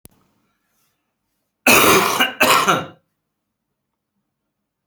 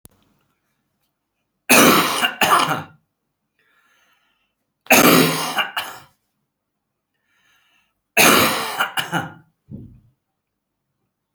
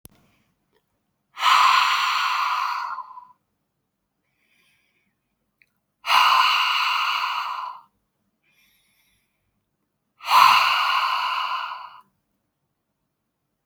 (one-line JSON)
{"cough_length": "4.9 s", "cough_amplitude": 32768, "cough_signal_mean_std_ratio": 0.37, "three_cough_length": "11.3 s", "three_cough_amplitude": 32768, "three_cough_signal_mean_std_ratio": 0.37, "exhalation_length": "13.7 s", "exhalation_amplitude": 26529, "exhalation_signal_mean_std_ratio": 0.46, "survey_phase": "beta (2021-08-13 to 2022-03-07)", "age": "45-64", "gender": "Male", "wearing_mask": "No", "symptom_cough_any": true, "smoker_status": "Never smoked", "respiratory_condition_asthma": false, "respiratory_condition_other": false, "recruitment_source": "REACT", "submission_delay": "2 days", "covid_test_result": "Negative", "covid_test_method": "RT-qPCR", "influenza_a_test_result": "Negative", "influenza_b_test_result": "Negative"}